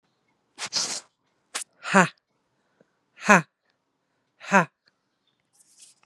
{"exhalation_length": "6.1 s", "exhalation_amplitude": 32716, "exhalation_signal_mean_std_ratio": 0.22, "survey_phase": "beta (2021-08-13 to 2022-03-07)", "age": "18-44", "gender": "Female", "wearing_mask": "No", "symptom_cough_any": true, "symptom_runny_or_blocked_nose": true, "symptom_fever_high_temperature": true, "symptom_headache": true, "symptom_onset": "4 days", "smoker_status": "Never smoked", "respiratory_condition_asthma": false, "respiratory_condition_other": false, "recruitment_source": "Test and Trace", "submission_delay": "2 days", "covid_test_result": "Positive", "covid_test_method": "RT-qPCR", "covid_ct_value": 26.8, "covid_ct_gene": "ORF1ab gene", "covid_ct_mean": 27.2, "covid_viral_load": "1200 copies/ml", "covid_viral_load_category": "Minimal viral load (< 10K copies/ml)"}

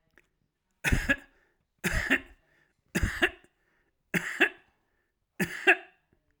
{"cough_length": "6.4 s", "cough_amplitude": 12688, "cough_signal_mean_std_ratio": 0.34, "survey_phase": "alpha (2021-03-01 to 2021-08-12)", "age": "45-64", "gender": "Male", "wearing_mask": "No", "symptom_none": true, "smoker_status": "Ex-smoker", "respiratory_condition_asthma": false, "respiratory_condition_other": false, "recruitment_source": "REACT", "submission_delay": "1 day", "covid_test_result": "Negative", "covid_test_method": "RT-qPCR"}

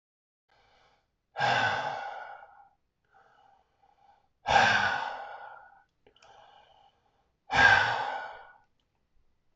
{"exhalation_length": "9.6 s", "exhalation_amplitude": 12498, "exhalation_signal_mean_std_ratio": 0.37, "survey_phase": "alpha (2021-03-01 to 2021-08-12)", "age": "18-44", "gender": "Male", "wearing_mask": "No", "symptom_none": true, "smoker_status": "Ex-smoker", "respiratory_condition_asthma": false, "respiratory_condition_other": false, "recruitment_source": "REACT", "submission_delay": "1 day", "covid_test_result": "Negative", "covid_test_method": "RT-qPCR"}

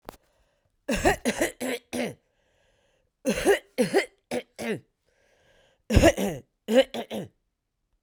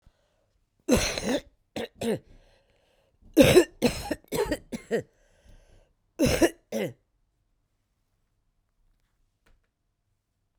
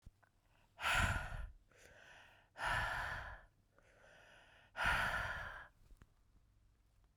{"three_cough_length": "8.0 s", "three_cough_amplitude": 23296, "three_cough_signal_mean_std_ratio": 0.39, "cough_length": "10.6 s", "cough_amplitude": 21657, "cough_signal_mean_std_ratio": 0.31, "exhalation_length": "7.2 s", "exhalation_amplitude": 2473, "exhalation_signal_mean_std_ratio": 0.48, "survey_phase": "beta (2021-08-13 to 2022-03-07)", "age": "45-64", "gender": "Female", "wearing_mask": "No", "symptom_cough_any": true, "symptom_runny_or_blocked_nose": true, "symptom_fever_high_temperature": true, "symptom_onset": "6 days", "smoker_status": "Ex-smoker", "respiratory_condition_asthma": false, "respiratory_condition_other": false, "recruitment_source": "Test and Trace", "submission_delay": "2 days", "covid_test_result": "Positive", "covid_test_method": "RT-qPCR", "covid_ct_value": 26.8, "covid_ct_gene": "ORF1ab gene", "covid_ct_mean": 27.4, "covid_viral_load": "1000 copies/ml", "covid_viral_load_category": "Minimal viral load (< 10K copies/ml)"}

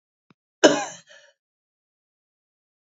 {"cough_length": "3.0 s", "cough_amplitude": 29736, "cough_signal_mean_std_ratio": 0.18, "survey_phase": "beta (2021-08-13 to 2022-03-07)", "age": "45-64", "gender": "Female", "wearing_mask": "No", "symptom_cough_any": true, "symptom_runny_or_blocked_nose": true, "symptom_shortness_of_breath": true, "symptom_sore_throat": true, "symptom_fatigue": true, "smoker_status": "Never smoked", "respiratory_condition_asthma": true, "respiratory_condition_other": false, "recruitment_source": "Test and Trace", "submission_delay": "1 day", "covid_test_result": "Positive", "covid_test_method": "LFT"}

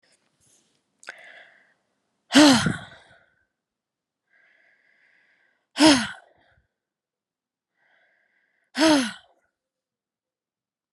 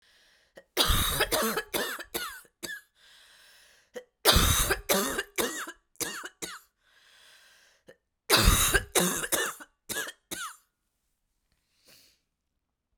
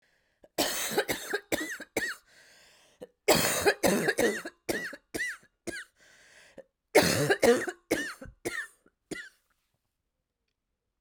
{"exhalation_length": "10.9 s", "exhalation_amplitude": 28264, "exhalation_signal_mean_std_ratio": 0.23, "three_cough_length": "13.0 s", "three_cough_amplitude": 15689, "three_cough_signal_mean_std_ratio": 0.43, "cough_length": "11.0 s", "cough_amplitude": 12813, "cough_signal_mean_std_ratio": 0.43, "survey_phase": "alpha (2021-03-01 to 2021-08-12)", "age": "18-44", "gender": "Female", "wearing_mask": "No", "symptom_fatigue": true, "symptom_headache": true, "symptom_change_to_sense_of_smell_or_taste": true, "symptom_onset": "3 days", "smoker_status": "Never smoked", "respiratory_condition_asthma": false, "respiratory_condition_other": false, "recruitment_source": "Test and Trace", "submission_delay": "1 day", "covid_test_result": "Positive", "covid_test_method": "RT-qPCR", "covid_ct_value": 36.0, "covid_ct_gene": "N gene"}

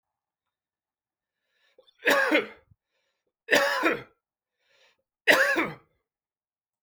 {"three_cough_length": "6.8 s", "three_cough_amplitude": 17288, "three_cough_signal_mean_std_ratio": 0.34, "survey_phase": "beta (2021-08-13 to 2022-03-07)", "age": "65+", "gender": "Male", "wearing_mask": "No", "symptom_none": true, "smoker_status": "Ex-smoker", "respiratory_condition_asthma": false, "respiratory_condition_other": false, "recruitment_source": "REACT", "submission_delay": "5 days", "covid_test_result": "Negative", "covid_test_method": "RT-qPCR"}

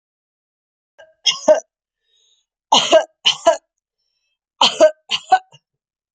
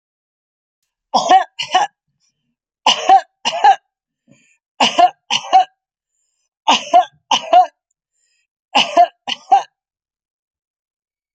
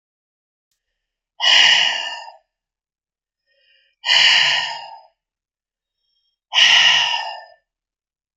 {"three_cough_length": "6.1 s", "three_cough_amplitude": 32285, "three_cough_signal_mean_std_ratio": 0.32, "cough_length": "11.3 s", "cough_amplitude": 32767, "cough_signal_mean_std_ratio": 0.36, "exhalation_length": "8.4 s", "exhalation_amplitude": 32768, "exhalation_signal_mean_std_ratio": 0.41, "survey_phase": "beta (2021-08-13 to 2022-03-07)", "age": "45-64", "gender": "Female", "wearing_mask": "No", "symptom_none": true, "symptom_onset": "4 days", "smoker_status": "Never smoked", "respiratory_condition_asthma": false, "respiratory_condition_other": false, "recruitment_source": "REACT", "submission_delay": "1 day", "covid_test_result": "Negative", "covid_test_method": "RT-qPCR", "influenza_a_test_result": "Negative", "influenza_b_test_result": "Negative"}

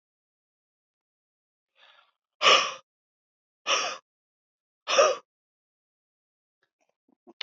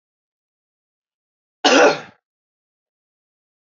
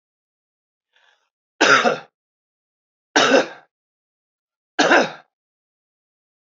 {"exhalation_length": "7.4 s", "exhalation_amplitude": 18803, "exhalation_signal_mean_std_ratio": 0.24, "cough_length": "3.7 s", "cough_amplitude": 27075, "cough_signal_mean_std_ratio": 0.24, "three_cough_length": "6.5 s", "three_cough_amplitude": 27602, "three_cough_signal_mean_std_ratio": 0.3, "survey_phase": "beta (2021-08-13 to 2022-03-07)", "age": "65+", "gender": "Male", "wearing_mask": "No", "symptom_runny_or_blocked_nose": true, "symptom_fatigue": true, "symptom_headache": true, "symptom_change_to_sense_of_smell_or_taste": true, "symptom_onset": "4 days", "smoker_status": "Never smoked", "respiratory_condition_asthma": false, "respiratory_condition_other": false, "recruitment_source": "Test and Trace", "submission_delay": "2 days", "covid_test_result": "Positive", "covid_test_method": "RT-qPCR", "covid_ct_value": 15.4, "covid_ct_gene": "ORF1ab gene", "covid_ct_mean": 15.9, "covid_viral_load": "6300000 copies/ml", "covid_viral_load_category": "High viral load (>1M copies/ml)"}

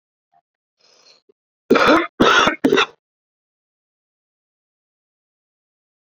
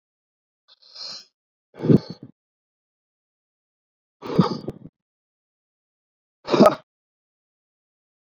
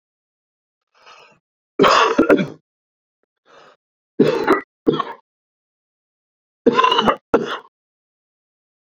{"cough_length": "6.1 s", "cough_amplitude": 32767, "cough_signal_mean_std_ratio": 0.3, "exhalation_length": "8.3 s", "exhalation_amplitude": 26511, "exhalation_signal_mean_std_ratio": 0.21, "three_cough_length": "9.0 s", "three_cough_amplitude": 30082, "three_cough_signal_mean_std_ratio": 0.35, "survey_phase": "beta (2021-08-13 to 2022-03-07)", "age": "45-64", "gender": "Male", "wearing_mask": "No", "symptom_none": true, "smoker_status": "Current smoker (1 to 10 cigarettes per day)", "respiratory_condition_asthma": false, "respiratory_condition_other": false, "recruitment_source": "REACT", "submission_delay": "3 days", "covid_test_result": "Negative", "covid_test_method": "RT-qPCR"}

